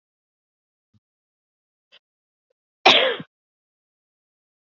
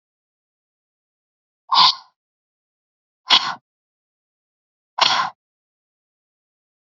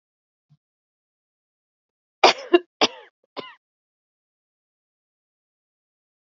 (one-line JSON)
{"cough_length": "4.7 s", "cough_amplitude": 29936, "cough_signal_mean_std_ratio": 0.19, "exhalation_length": "6.9 s", "exhalation_amplitude": 32768, "exhalation_signal_mean_std_ratio": 0.23, "three_cough_length": "6.2 s", "three_cough_amplitude": 28548, "three_cough_signal_mean_std_ratio": 0.15, "survey_phase": "beta (2021-08-13 to 2022-03-07)", "age": "45-64", "gender": "Female", "wearing_mask": "No", "symptom_none": true, "smoker_status": "Ex-smoker", "respiratory_condition_asthma": false, "respiratory_condition_other": false, "recruitment_source": "REACT", "submission_delay": "1 day", "covid_test_result": "Negative", "covid_test_method": "RT-qPCR", "influenza_a_test_result": "Negative", "influenza_b_test_result": "Negative"}